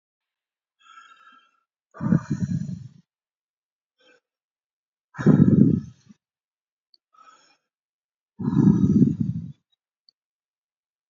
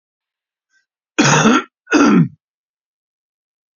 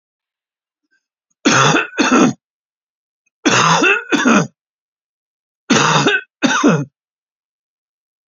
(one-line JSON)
{"exhalation_length": "11.1 s", "exhalation_amplitude": 25800, "exhalation_signal_mean_std_ratio": 0.32, "cough_length": "3.8 s", "cough_amplitude": 29779, "cough_signal_mean_std_ratio": 0.39, "three_cough_length": "8.3 s", "three_cough_amplitude": 32767, "three_cough_signal_mean_std_ratio": 0.47, "survey_phase": "beta (2021-08-13 to 2022-03-07)", "age": "65+", "gender": "Male", "wearing_mask": "No", "symptom_none": true, "smoker_status": "Ex-smoker", "respiratory_condition_asthma": true, "respiratory_condition_other": true, "recruitment_source": "REACT", "submission_delay": "1 day", "covid_test_result": "Negative", "covid_test_method": "RT-qPCR", "influenza_a_test_result": "Negative", "influenza_b_test_result": "Negative"}